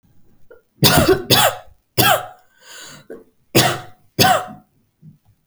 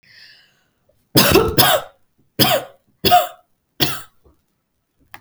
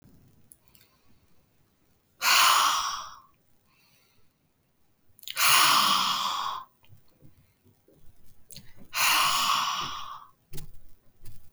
{"cough_length": "5.5 s", "cough_amplitude": 32768, "cough_signal_mean_std_ratio": 0.43, "three_cough_length": "5.2 s", "three_cough_amplitude": 32768, "three_cough_signal_mean_std_ratio": 0.39, "exhalation_length": "11.5 s", "exhalation_amplitude": 18387, "exhalation_signal_mean_std_ratio": 0.46, "survey_phase": "alpha (2021-03-01 to 2021-08-12)", "age": "18-44", "gender": "Female", "wearing_mask": "No", "symptom_none": true, "smoker_status": "Never smoked", "respiratory_condition_asthma": false, "respiratory_condition_other": false, "recruitment_source": "REACT", "submission_delay": "1 day", "covid_test_result": "Negative", "covid_test_method": "RT-qPCR"}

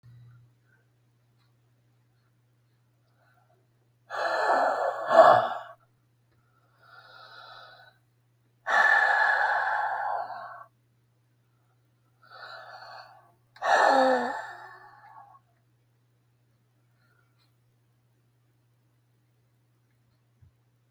{"exhalation_length": "20.9 s", "exhalation_amplitude": 21803, "exhalation_signal_mean_std_ratio": 0.34, "survey_phase": "beta (2021-08-13 to 2022-03-07)", "age": "65+", "gender": "Male", "wearing_mask": "No", "symptom_cough_any": true, "symptom_runny_or_blocked_nose": true, "symptom_shortness_of_breath": true, "symptom_change_to_sense_of_smell_or_taste": true, "symptom_loss_of_taste": true, "smoker_status": "Current smoker (1 to 10 cigarettes per day)", "respiratory_condition_asthma": false, "respiratory_condition_other": true, "recruitment_source": "REACT", "submission_delay": "2 days", "covid_test_result": "Negative", "covid_test_method": "RT-qPCR", "influenza_a_test_result": "Negative", "influenza_b_test_result": "Negative"}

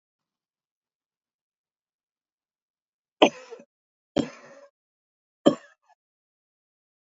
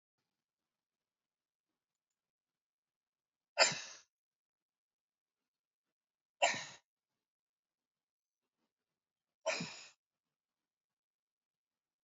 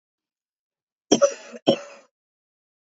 {"three_cough_length": "7.1 s", "three_cough_amplitude": 27188, "three_cough_signal_mean_std_ratio": 0.13, "exhalation_length": "12.0 s", "exhalation_amplitude": 6489, "exhalation_signal_mean_std_ratio": 0.16, "cough_length": "2.9 s", "cough_amplitude": 29118, "cough_signal_mean_std_ratio": 0.24, "survey_phase": "beta (2021-08-13 to 2022-03-07)", "age": "65+", "gender": "Female", "wearing_mask": "No", "symptom_none": true, "smoker_status": "Never smoked", "respiratory_condition_asthma": false, "respiratory_condition_other": false, "recruitment_source": "REACT", "submission_delay": "3 days", "covid_test_result": "Negative", "covid_test_method": "RT-qPCR", "influenza_a_test_result": "Negative", "influenza_b_test_result": "Negative"}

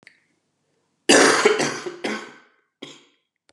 {"cough_length": "3.5 s", "cough_amplitude": 28287, "cough_signal_mean_std_ratio": 0.38, "survey_phase": "beta (2021-08-13 to 2022-03-07)", "age": "45-64", "gender": "Male", "wearing_mask": "No", "symptom_cough_any": true, "symptom_new_continuous_cough": true, "symptom_runny_or_blocked_nose": true, "symptom_sore_throat": true, "symptom_other": true, "symptom_onset": "4 days", "smoker_status": "Ex-smoker", "respiratory_condition_asthma": false, "respiratory_condition_other": false, "recruitment_source": "Test and Trace", "submission_delay": "2 days", "covid_test_result": "Positive", "covid_test_method": "RT-qPCR", "covid_ct_value": 15.2, "covid_ct_gene": "S gene", "covid_ct_mean": 15.6, "covid_viral_load": "7800000 copies/ml", "covid_viral_load_category": "High viral load (>1M copies/ml)"}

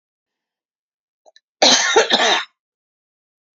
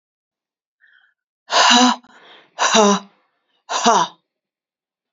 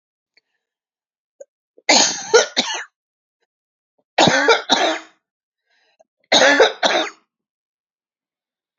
{"cough_length": "3.6 s", "cough_amplitude": 32767, "cough_signal_mean_std_ratio": 0.37, "exhalation_length": "5.1 s", "exhalation_amplitude": 32448, "exhalation_signal_mean_std_ratio": 0.39, "three_cough_length": "8.8 s", "three_cough_amplitude": 32722, "three_cough_signal_mean_std_ratio": 0.37, "survey_phase": "beta (2021-08-13 to 2022-03-07)", "age": "45-64", "gender": "Female", "wearing_mask": "No", "symptom_cough_any": true, "symptom_abdominal_pain": true, "symptom_fatigue": true, "smoker_status": "Never smoked", "respiratory_condition_asthma": false, "respiratory_condition_other": false, "recruitment_source": "Test and Trace", "submission_delay": "-1 day", "covid_test_result": "Negative", "covid_test_method": "LFT"}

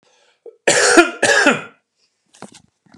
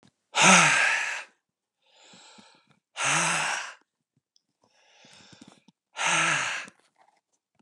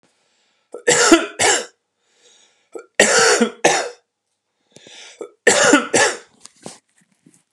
{"cough_length": "3.0 s", "cough_amplitude": 32768, "cough_signal_mean_std_ratio": 0.42, "exhalation_length": "7.6 s", "exhalation_amplitude": 21555, "exhalation_signal_mean_std_ratio": 0.4, "three_cough_length": "7.5 s", "three_cough_amplitude": 32768, "three_cough_signal_mean_std_ratio": 0.42, "survey_phase": "beta (2021-08-13 to 2022-03-07)", "age": "45-64", "gender": "Male", "wearing_mask": "No", "symptom_abdominal_pain": true, "symptom_fatigue": true, "symptom_headache": true, "symptom_onset": "12 days", "smoker_status": "Never smoked", "respiratory_condition_asthma": false, "respiratory_condition_other": false, "recruitment_source": "REACT", "submission_delay": "3 days", "covid_test_result": "Negative", "covid_test_method": "RT-qPCR", "influenza_a_test_result": "Negative", "influenza_b_test_result": "Negative"}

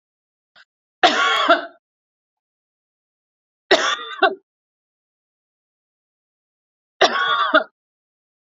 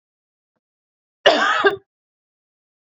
{"three_cough_length": "8.4 s", "three_cough_amplitude": 30130, "three_cough_signal_mean_std_ratio": 0.32, "cough_length": "3.0 s", "cough_amplitude": 30124, "cough_signal_mean_std_ratio": 0.3, "survey_phase": "beta (2021-08-13 to 2022-03-07)", "age": "18-44", "gender": "Female", "wearing_mask": "No", "symptom_none": true, "smoker_status": "Never smoked", "respiratory_condition_asthma": false, "respiratory_condition_other": false, "recruitment_source": "REACT", "submission_delay": "4 days", "covid_test_result": "Negative", "covid_test_method": "RT-qPCR", "influenza_a_test_result": "Unknown/Void", "influenza_b_test_result": "Unknown/Void"}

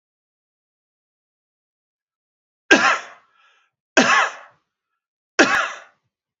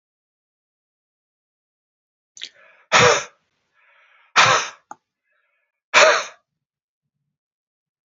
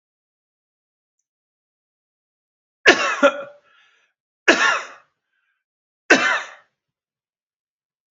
{"three_cough_length": "6.4 s", "three_cough_amplitude": 32767, "three_cough_signal_mean_std_ratio": 0.29, "exhalation_length": "8.1 s", "exhalation_amplitude": 31934, "exhalation_signal_mean_std_ratio": 0.26, "cough_length": "8.1 s", "cough_amplitude": 29072, "cough_signal_mean_std_ratio": 0.26, "survey_phase": "beta (2021-08-13 to 2022-03-07)", "age": "45-64", "gender": "Male", "wearing_mask": "No", "symptom_none": true, "smoker_status": "Ex-smoker", "respiratory_condition_asthma": false, "respiratory_condition_other": false, "recruitment_source": "REACT", "submission_delay": "2 days", "covid_test_result": "Negative", "covid_test_method": "RT-qPCR", "influenza_a_test_result": "Negative", "influenza_b_test_result": "Negative"}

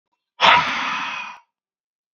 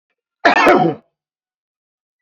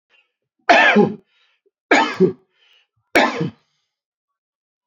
{"exhalation_length": "2.1 s", "exhalation_amplitude": 29145, "exhalation_signal_mean_std_ratio": 0.43, "cough_length": "2.2 s", "cough_amplitude": 27740, "cough_signal_mean_std_ratio": 0.38, "three_cough_length": "4.9 s", "three_cough_amplitude": 28933, "three_cough_signal_mean_std_ratio": 0.36, "survey_phase": "beta (2021-08-13 to 2022-03-07)", "age": "45-64", "gender": "Male", "wearing_mask": "No", "symptom_cough_any": true, "symptom_fatigue": true, "symptom_onset": "2 days", "smoker_status": "Never smoked", "respiratory_condition_asthma": false, "respiratory_condition_other": false, "recruitment_source": "Test and Trace", "submission_delay": "1 day", "covid_test_result": "Positive", "covid_test_method": "RT-qPCR", "covid_ct_value": 22.6, "covid_ct_gene": "N gene", "covid_ct_mean": 23.1, "covid_viral_load": "26000 copies/ml", "covid_viral_load_category": "Low viral load (10K-1M copies/ml)"}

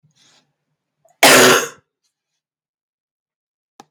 {"cough_length": "3.9 s", "cough_amplitude": 32767, "cough_signal_mean_std_ratio": 0.27, "survey_phase": "beta (2021-08-13 to 2022-03-07)", "age": "45-64", "gender": "Male", "wearing_mask": "No", "symptom_cough_any": true, "symptom_runny_or_blocked_nose": true, "symptom_sore_throat": true, "symptom_fatigue": true, "smoker_status": "Never smoked", "respiratory_condition_asthma": false, "respiratory_condition_other": false, "recruitment_source": "Test and Trace", "submission_delay": "1 day", "covid_test_result": "Positive", "covid_test_method": "RT-qPCR", "covid_ct_value": 19.8, "covid_ct_gene": "N gene"}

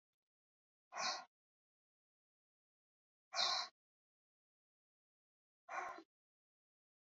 {"exhalation_length": "7.2 s", "exhalation_amplitude": 2162, "exhalation_signal_mean_std_ratio": 0.26, "survey_phase": "beta (2021-08-13 to 2022-03-07)", "age": "45-64", "gender": "Female", "wearing_mask": "No", "symptom_none": true, "smoker_status": "Ex-smoker", "respiratory_condition_asthma": false, "respiratory_condition_other": false, "recruitment_source": "REACT", "submission_delay": "1 day", "covid_test_result": "Negative", "covid_test_method": "RT-qPCR", "covid_ct_value": 38.9, "covid_ct_gene": "N gene", "influenza_a_test_result": "Negative", "influenza_b_test_result": "Negative"}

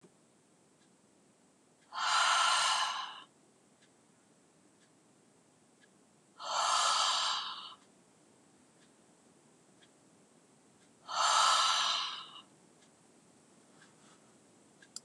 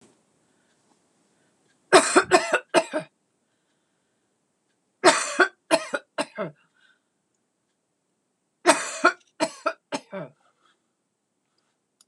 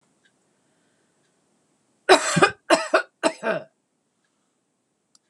{"exhalation_length": "15.0 s", "exhalation_amplitude": 5311, "exhalation_signal_mean_std_ratio": 0.41, "three_cough_length": "12.1 s", "three_cough_amplitude": 26027, "three_cough_signal_mean_std_ratio": 0.27, "cough_length": "5.3 s", "cough_amplitude": 26027, "cough_signal_mean_std_ratio": 0.28, "survey_phase": "beta (2021-08-13 to 2022-03-07)", "age": "65+", "gender": "Female", "wearing_mask": "No", "symptom_none": true, "smoker_status": "Never smoked", "respiratory_condition_asthma": false, "respiratory_condition_other": false, "recruitment_source": "REACT", "submission_delay": "2 days", "covid_test_result": "Negative", "covid_test_method": "RT-qPCR"}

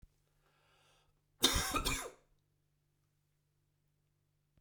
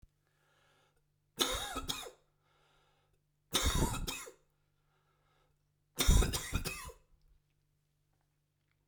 {"cough_length": "4.6 s", "cough_amplitude": 7056, "cough_signal_mean_std_ratio": 0.28, "three_cough_length": "8.9 s", "three_cough_amplitude": 7484, "three_cough_signal_mean_std_ratio": 0.33, "survey_phase": "beta (2021-08-13 to 2022-03-07)", "age": "18-44", "gender": "Male", "wearing_mask": "No", "symptom_cough_any": true, "symptom_change_to_sense_of_smell_or_taste": true, "symptom_onset": "5 days", "smoker_status": "Never smoked", "respiratory_condition_asthma": false, "respiratory_condition_other": false, "recruitment_source": "Test and Trace", "submission_delay": "1 day", "covid_test_result": "Positive", "covid_test_method": "RT-qPCR", "covid_ct_value": 15.7, "covid_ct_gene": "ORF1ab gene", "covid_ct_mean": 15.8, "covid_viral_load": "6700000 copies/ml", "covid_viral_load_category": "High viral load (>1M copies/ml)"}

